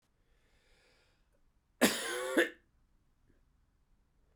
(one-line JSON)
{"cough_length": "4.4 s", "cough_amplitude": 8787, "cough_signal_mean_std_ratio": 0.27, "survey_phase": "beta (2021-08-13 to 2022-03-07)", "age": "45-64", "gender": "Male", "wearing_mask": "No", "symptom_cough_any": true, "symptom_runny_or_blocked_nose": true, "symptom_abdominal_pain": true, "symptom_fatigue": true, "symptom_headache": true, "smoker_status": "Never smoked", "respiratory_condition_asthma": false, "respiratory_condition_other": false, "recruitment_source": "Test and Trace", "submission_delay": "1 day", "covid_test_result": "Positive", "covid_test_method": "LFT"}